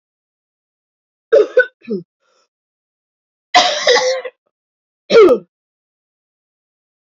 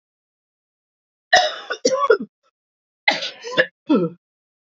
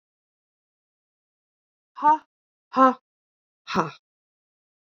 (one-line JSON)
{"three_cough_length": "7.1 s", "three_cough_amplitude": 30358, "three_cough_signal_mean_std_ratio": 0.33, "cough_length": "4.6 s", "cough_amplitude": 29207, "cough_signal_mean_std_ratio": 0.37, "exhalation_length": "4.9 s", "exhalation_amplitude": 21877, "exhalation_signal_mean_std_ratio": 0.23, "survey_phase": "beta (2021-08-13 to 2022-03-07)", "age": "45-64", "gender": "Female", "wearing_mask": "No", "symptom_cough_any": true, "symptom_runny_or_blocked_nose": true, "symptom_shortness_of_breath": true, "symptom_sore_throat": true, "symptom_diarrhoea": true, "symptom_fatigue": true, "symptom_fever_high_temperature": true, "symptom_headache": true, "smoker_status": "Never smoked", "respiratory_condition_asthma": true, "respiratory_condition_other": false, "recruitment_source": "Test and Trace", "submission_delay": "1 day", "covid_test_result": "Positive", "covid_test_method": "LFT"}